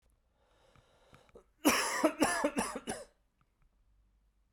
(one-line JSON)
{"three_cough_length": "4.5 s", "three_cough_amplitude": 7309, "three_cough_signal_mean_std_ratio": 0.38, "survey_phase": "beta (2021-08-13 to 2022-03-07)", "age": "18-44", "gender": "Male", "wearing_mask": "No", "symptom_cough_any": true, "symptom_new_continuous_cough": true, "symptom_runny_or_blocked_nose": true, "symptom_fatigue": true, "symptom_fever_high_temperature": true, "symptom_headache": true, "symptom_change_to_sense_of_smell_or_taste": true, "symptom_loss_of_taste": true, "symptom_other": true, "symptom_onset": "3 days", "smoker_status": "Never smoked", "respiratory_condition_asthma": false, "respiratory_condition_other": false, "recruitment_source": "Test and Trace", "submission_delay": "1 day", "covid_test_result": "Positive", "covid_test_method": "RT-qPCR", "covid_ct_value": 14.9, "covid_ct_gene": "ORF1ab gene", "covid_ct_mean": 15.4, "covid_viral_load": "9100000 copies/ml", "covid_viral_load_category": "High viral load (>1M copies/ml)"}